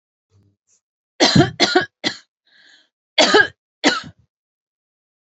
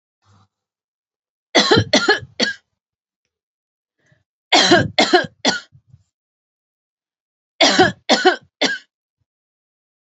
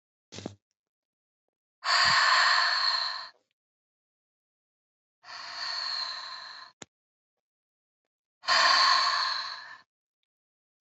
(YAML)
cough_length: 5.4 s
cough_amplitude: 30806
cough_signal_mean_std_ratio: 0.33
three_cough_length: 10.1 s
three_cough_amplitude: 31794
three_cough_signal_mean_std_ratio: 0.35
exhalation_length: 10.8 s
exhalation_amplitude: 10371
exhalation_signal_mean_std_ratio: 0.44
survey_phase: alpha (2021-03-01 to 2021-08-12)
age: 65+
gender: Female
wearing_mask: 'No'
symptom_fatigue: true
symptom_onset: 12 days
smoker_status: Ex-smoker
respiratory_condition_asthma: false
respiratory_condition_other: false
recruitment_source: REACT
submission_delay: 1 day
covid_test_result: Negative
covid_test_method: RT-qPCR